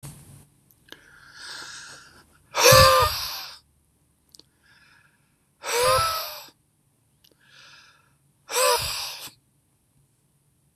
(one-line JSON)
{"exhalation_length": "10.8 s", "exhalation_amplitude": 25976, "exhalation_signal_mean_std_ratio": 0.33, "survey_phase": "beta (2021-08-13 to 2022-03-07)", "age": "45-64", "gender": "Male", "wearing_mask": "No", "symptom_none": true, "smoker_status": "Never smoked", "respiratory_condition_asthma": false, "respiratory_condition_other": false, "recruitment_source": "REACT", "submission_delay": "4 days", "covid_test_result": "Negative", "covid_test_method": "RT-qPCR", "influenza_a_test_result": "Negative", "influenza_b_test_result": "Negative"}